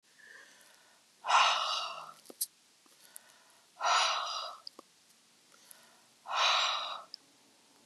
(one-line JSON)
{"exhalation_length": "7.9 s", "exhalation_amplitude": 8622, "exhalation_signal_mean_std_ratio": 0.43, "survey_phase": "beta (2021-08-13 to 2022-03-07)", "age": "65+", "gender": "Female", "wearing_mask": "No", "symptom_none": true, "smoker_status": "Never smoked", "respiratory_condition_asthma": false, "respiratory_condition_other": false, "recruitment_source": "REACT", "submission_delay": "2 days", "covid_test_result": "Negative", "covid_test_method": "RT-qPCR", "influenza_a_test_result": "Negative", "influenza_b_test_result": "Negative"}